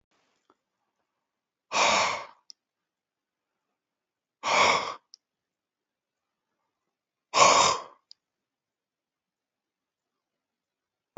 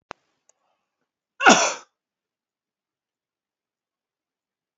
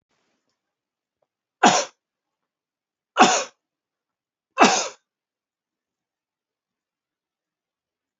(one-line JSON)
{"exhalation_length": "11.2 s", "exhalation_amplitude": 17784, "exhalation_signal_mean_std_ratio": 0.27, "cough_length": "4.8 s", "cough_amplitude": 28492, "cough_signal_mean_std_ratio": 0.18, "three_cough_length": "8.2 s", "three_cough_amplitude": 28019, "three_cough_signal_mean_std_ratio": 0.21, "survey_phase": "beta (2021-08-13 to 2022-03-07)", "age": "45-64", "gender": "Male", "wearing_mask": "No", "symptom_cough_any": true, "symptom_fatigue": true, "symptom_headache": true, "symptom_change_to_sense_of_smell_or_taste": true, "symptom_loss_of_taste": true, "symptom_onset": "4 days", "smoker_status": "Never smoked", "respiratory_condition_asthma": false, "respiratory_condition_other": false, "recruitment_source": "Test and Trace", "submission_delay": "2 days", "covid_test_result": "Positive", "covid_test_method": "RT-qPCR", "covid_ct_value": 15.3, "covid_ct_gene": "ORF1ab gene", "covid_ct_mean": 15.6, "covid_viral_load": "7700000 copies/ml", "covid_viral_load_category": "High viral load (>1M copies/ml)"}